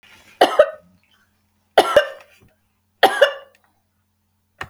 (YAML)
three_cough_length: 4.7 s
three_cough_amplitude: 32768
three_cough_signal_mean_std_ratio: 0.29
survey_phase: beta (2021-08-13 to 2022-03-07)
age: 45-64
gender: Female
wearing_mask: 'No'
symptom_none: true
smoker_status: Never smoked
respiratory_condition_asthma: false
respiratory_condition_other: false
recruitment_source: REACT
submission_delay: 1 day
covid_test_result: Negative
covid_test_method: RT-qPCR
influenza_a_test_result: Negative
influenza_b_test_result: Negative